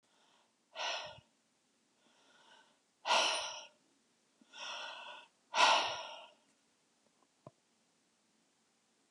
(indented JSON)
{
  "exhalation_length": "9.1 s",
  "exhalation_amplitude": 6209,
  "exhalation_signal_mean_std_ratio": 0.31,
  "survey_phase": "beta (2021-08-13 to 2022-03-07)",
  "age": "65+",
  "gender": "Female",
  "wearing_mask": "No",
  "symptom_none": true,
  "smoker_status": "Never smoked",
  "respiratory_condition_asthma": false,
  "respiratory_condition_other": false,
  "recruitment_source": "REACT",
  "submission_delay": "1 day",
  "covid_test_result": "Negative",
  "covid_test_method": "RT-qPCR",
  "influenza_a_test_result": "Negative",
  "influenza_b_test_result": "Negative"
}